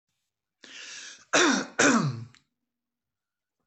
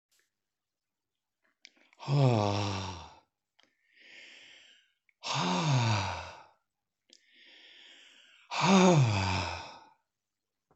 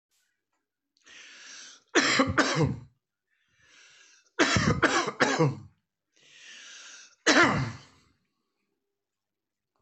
{"cough_length": "3.7 s", "cough_amplitude": 15246, "cough_signal_mean_std_ratio": 0.38, "exhalation_length": "10.8 s", "exhalation_amplitude": 9976, "exhalation_signal_mean_std_ratio": 0.42, "three_cough_length": "9.8 s", "three_cough_amplitude": 16462, "three_cough_signal_mean_std_ratio": 0.39, "survey_phase": "alpha (2021-03-01 to 2021-08-12)", "age": "65+", "gender": "Male", "wearing_mask": "No", "symptom_none": true, "smoker_status": "Never smoked", "respiratory_condition_asthma": false, "respiratory_condition_other": false, "recruitment_source": "REACT", "submission_delay": "2 days", "covid_test_result": "Negative", "covid_test_method": "RT-qPCR"}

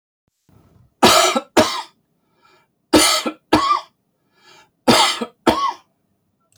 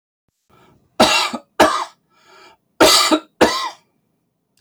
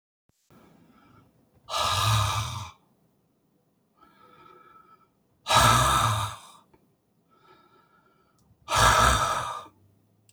{"three_cough_length": "6.6 s", "three_cough_amplitude": 30417, "three_cough_signal_mean_std_ratio": 0.41, "cough_length": "4.6 s", "cough_amplitude": 30969, "cough_signal_mean_std_ratio": 0.41, "exhalation_length": "10.3 s", "exhalation_amplitude": 17197, "exhalation_signal_mean_std_ratio": 0.41, "survey_phase": "alpha (2021-03-01 to 2021-08-12)", "age": "65+", "gender": "Male", "wearing_mask": "No", "symptom_none": true, "smoker_status": "Ex-smoker", "respiratory_condition_asthma": false, "respiratory_condition_other": false, "recruitment_source": "REACT", "submission_delay": "1 day", "covid_test_result": "Negative", "covid_test_method": "RT-qPCR"}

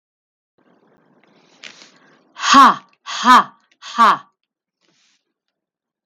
{"exhalation_length": "6.1 s", "exhalation_amplitude": 32768, "exhalation_signal_mean_std_ratio": 0.29, "survey_phase": "beta (2021-08-13 to 2022-03-07)", "age": "65+", "gender": "Female", "wearing_mask": "No", "symptom_none": true, "smoker_status": "Never smoked", "respiratory_condition_asthma": false, "respiratory_condition_other": false, "recruitment_source": "REACT", "submission_delay": "0 days", "covid_test_result": "Negative", "covid_test_method": "RT-qPCR"}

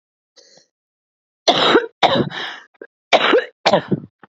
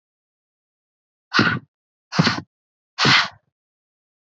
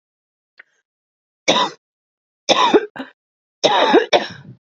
{"cough_length": "4.4 s", "cough_amplitude": 32767, "cough_signal_mean_std_ratio": 0.43, "exhalation_length": "4.3 s", "exhalation_amplitude": 28175, "exhalation_signal_mean_std_ratio": 0.32, "three_cough_length": "4.6 s", "three_cough_amplitude": 32767, "three_cough_signal_mean_std_ratio": 0.39, "survey_phase": "beta (2021-08-13 to 2022-03-07)", "age": "18-44", "gender": "Female", "wearing_mask": "No", "symptom_cough_any": true, "symptom_runny_or_blocked_nose": true, "symptom_shortness_of_breath": true, "symptom_sore_throat": true, "symptom_abdominal_pain": true, "symptom_fatigue": true, "symptom_headache": true, "symptom_change_to_sense_of_smell_or_taste": true, "symptom_onset": "4 days", "smoker_status": "Current smoker (11 or more cigarettes per day)", "respiratory_condition_asthma": false, "respiratory_condition_other": false, "recruitment_source": "Test and Trace", "submission_delay": "3 days", "covid_test_result": "Positive", "covid_test_method": "RT-qPCR", "covid_ct_value": 16.7, "covid_ct_gene": "ORF1ab gene", "covid_ct_mean": 17.1, "covid_viral_load": "2500000 copies/ml", "covid_viral_load_category": "High viral load (>1M copies/ml)"}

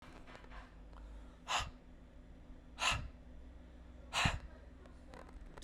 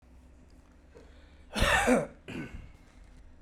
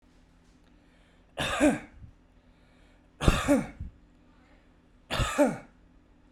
{"exhalation_length": "5.6 s", "exhalation_amplitude": 4334, "exhalation_signal_mean_std_ratio": 0.53, "cough_length": "3.4 s", "cough_amplitude": 8494, "cough_signal_mean_std_ratio": 0.4, "three_cough_length": "6.3 s", "three_cough_amplitude": 15275, "three_cough_signal_mean_std_ratio": 0.36, "survey_phase": "beta (2021-08-13 to 2022-03-07)", "age": "45-64", "gender": "Male", "wearing_mask": "No", "symptom_runny_or_blocked_nose": true, "smoker_status": "Never smoked", "respiratory_condition_asthma": true, "respiratory_condition_other": false, "recruitment_source": "Test and Trace", "submission_delay": "2 days", "covid_test_result": "Positive", "covid_test_method": "RT-qPCR", "covid_ct_value": 18.4, "covid_ct_gene": "ORF1ab gene", "covid_ct_mean": 19.0, "covid_viral_load": "580000 copies/ml", "covid_viral_load_category": "Low viral load (10K-1M copies/ml)"}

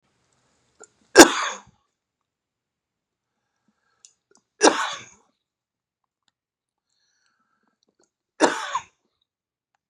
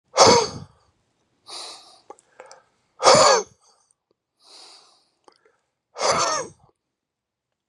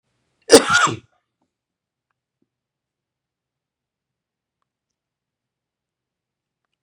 {"three_cough_length": "9.9 s", "three_cough_amplitude": 32768, "three_cough_signal_mean_std_ratio": 0.17, "exhalation_length": "7.7 s", "exhalation_amplitude": 30670, "exhalation_signal_mean_std_ratio": 0.31, "cough_length": "6.8 s", "cough_amplitude": 32768, "cough_signal_mean_std_ratio": 0.16, "survey_phase": "beta (2021-08-13 to 2022-03-07)", "age": "45-64", "gender": "Male", "wearing_mask": "No", "symptom_cough_any": true, "symptom_runny_or_blocked_nose": true, "symptom_fatigue": true, "symptom_fever_high_temperature": true, "symptom_onset": "3 days", "smoker_status": "Never smoked", "respiratory_condition_asthma": false, "respiratory_condition_other": false, "recruitment_source": "Test and Trace", "submission_delay": "2 days", "covid_test_result": "Positive", "covid_test_method": "RT-qPCR", "covid_ct_value": 17.5, "covid_ct_gene": "ORF1ab gene"}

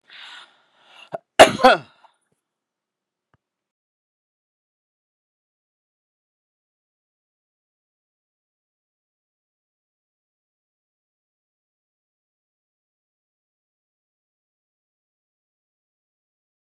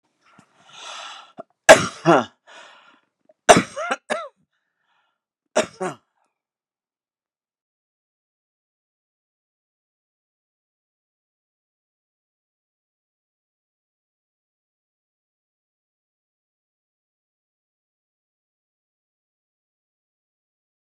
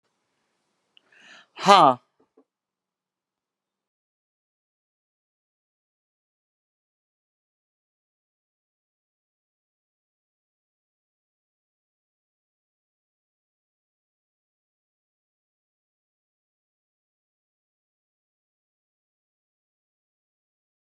{"cough_length": "16.6 s", "cough_amplitude": 32768, "cough_signal_mean_std_ratio": 0.1, "three_cough_length": "20.8 s", "three_cough_amplitude": 32768, "three_cough_signal_mean_std_ratio": 0.13, "exhalation_length": "20.9 s", "exhalation_amplitude": 31549, "exhalation_signal_mean_std_ratio": 0.09, "survey_phase": "beta (2021-08-13 to 2022-03-07)", "age": "65+", "gender": "Female", "wearing_mask": "No", "symptom_fatigue": true, "symptom_onset": "6 days", "smoker_status": "Ex-smoker", "respiratory_condition_asthma": false, "respiratory_condition_other": false, "recruitment_source": "REACT", "submission_delay": "5 days", "covid_test_result": "Negative", "covid_test_method": "RT-qPCR"}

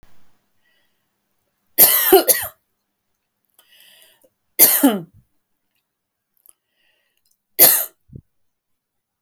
{"three_cough_length": "9.2 s", "three_cough_amplitude": 32768, "three_cough_signal_mean_std_ratio": 0.27, "survey_phase": "beta (2021-08-13 to 2022-03-07)", "age": "45-64", "gender": "Female", "wearing_mask": "No", "symptom_none": true, "smoker_status": "Never smoked", "respiratory_condition_asthma": false, "respiratory_condition_other": false, "recruitment_source": "REACT", "submission_delay": "3 days", "covid_test_result": "Negative", "covid_test_method": "RT-qPCR", "influenza_a_test_result": "Negative", "influenza_b_test_result": "Negative"}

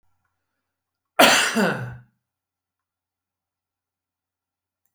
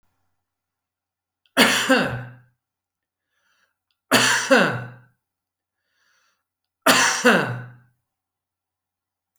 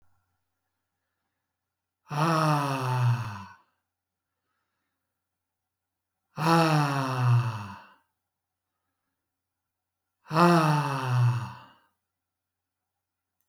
{"cough_length": "4.9 s", "cough_amplitude": 30443, "cough_signal_mean_std_ratio": 0.26, "three_cough_length": "9.4 s", "three_cough_amplitude": 28359, "three_cough_signal_mean_std_ratio": 0.35, "exhalation_length": "13.5 s", "exhalation_amplitude": 15451, "exhalation_signal_mean_std_ratio": 0.42, "survey_phase": "alpha (2021-03-01 to 2021-08-12)", "age": "65+", "gender": "Male", "wearing_mask": "No", "symptom_none": true, "smoker_status": "Never smoked", "respiratory_condition_asthma": false, "respiratory_condition_other": false, "recruitment_source": "REACT", "submission_delay": "3 days", "covid_test_result": "Negative", "covid_test_method": "RT-qPCR"}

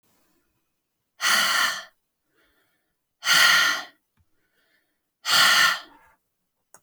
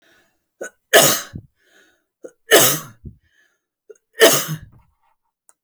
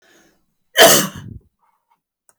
{"exhalation_length": "6.8 s", "exhalation_amplitude": 18877, "exhalation_signal_mean_std_ratio": 0.4, "three_cough_length": "5.6 s", "three_cough_amplitude": 32767, "three_cough_signal_mean_std_ratio": 0.31, "cough_length": "2.4 s", "cough_amplitude": 32768, "cough_signal_mean_std_ratio": 0.3, "survey_phase": "beta (2021-08-13 to 2022-03-07)", "age": "45-64", "gender": "Female", "wearing_mask": "No", "symptom_none": true, "smoker_status": "Never smoked", "respiratory_condition_asthma": false, "respiratory_condition_other": false, "recruitment_source": "REACT", "submission_delay": "2 days", "covid_test_result": "Negative", "covid_test_method": "RT-qPCR"}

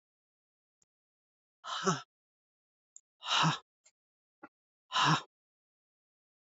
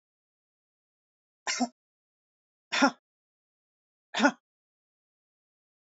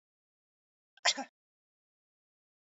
{"exhalation_length": "6.5 s", "exhalation_amplitude": 6204, "exhalation_signal_mean_std_ratio": 0.28, "three_cough_length": "6.0 s", "three_cough_amplitude": 14607, "three_cough_signal_mean_std_ratio": 0.2, "cough_length": "2.7 s", "cough_amplitude": 6935, "cough_signal_mean_std_ratio": 0.16, "survey_phase": "beta (2021-08-13 to 2022-03-07)", "age": "45-64", "gender": "Female", "wearing_mask": "No", "symptom_none": true, "smoker_status": "Never smoked", "respiratory_condition_asthma": false, "respiratory_condition_other": false, "recruitment_source": "REACT", "submission_delay": "2 days", "covid_test_result": "Negative", "covid_test_method": "RT-qPCR", "influenza_a_test_result": "Negative", "influenza_b_test_result": "Negative"}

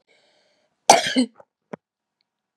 {"cough_length": "2.6 s", "cough_amplitude": 32768, "cough_signal_mean_std_ratio": 0.24, "survey_phase": "beta (2021-08-13 to 2022-03-07)", "age": "65+", "gender": "Female", "wearing_mask": "No", "symptom_none": true, "smoker_status": "Never smoked", "respiratory_condition_asthma": false, "respiratory_condition_other": false, "recruitment_source": "REACT", "submission_delay": "0 days", "covid_test_result": "Negative", "covid_test_method": "RT-qPCR", "influenza_a_test_result": "Negative", "influenza_b_test_result": "Negative"}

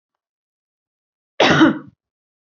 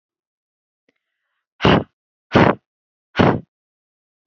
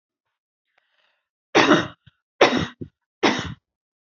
{"cough_length": "2.6 s", "cough_amplitude": 27343, "cough_signal_mean_std_ratio": 0.3, "exhalation_length": "4.3 s", "exhalation_amplitude": 27706, "exhalation_signal_mean_std_ratio": 0.28, "three_cough_length": "4.2 s", "three_cough_amplitude": 27405, "three_cough_signal_mean_std_ratio": 0.32, "survey_phase": "beta (2021-08-13 to 2022-03-07)", "age": "18-44", "gender": "Female", "wearing_mask": "No", "symptom_none": true, "smoker_status": "Never smoked", "respiratory_condition_asthma": false, "respiratory_condition_other": false, "recruitment_source": "REACT", "submission_delay": "2 days", "covid_test_result": "Negative", "covid_test_method": "RT-qPCR", "influenza_a_test_result": "Negative", "influenza_b_test_result": "Negative"}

